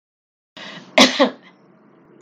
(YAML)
cough_length: 2.2 s
cough_amplitude: 32768
cough_signal_mean_std_ratio: 0.29
survey_phase: beta (2021-08-13 to 2022-03-07)
age: 65+
gender: Female
wearing_mask: 'No'
symptom_none: true
smoker_status: Never smoked
respiratory_condition_asthma: false
respiratory_condition_other: false
recruitment_source: REACT
submission_delay: 3 days
covid_test_result: Negative
covid_test_method: RT-qPCR
influenza_a_test_result: Negative
influenza_b_test_result: Negative